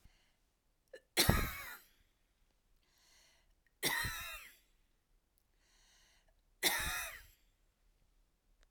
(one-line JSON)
{"three_cough_length": "8.7 s", "three_cough_amplitude": 6999, "three_cough_signal_mean_std_ratio": 0.31, "survey_phase": "alpha (2021-03-01 to 2021-08-12)", "age": "65+", "gender": "Female", "wearing_mask": "No", "symptom_none": true, "smoker_status": "Never smoked", "respiratory_condition_asthma": true, "respiratory_condition_other": false, "recruitment_source": "REACT", "submission_delay": "1 day", "covid_test_result": "Negative", "covid_test_method": "RT-qPCR"}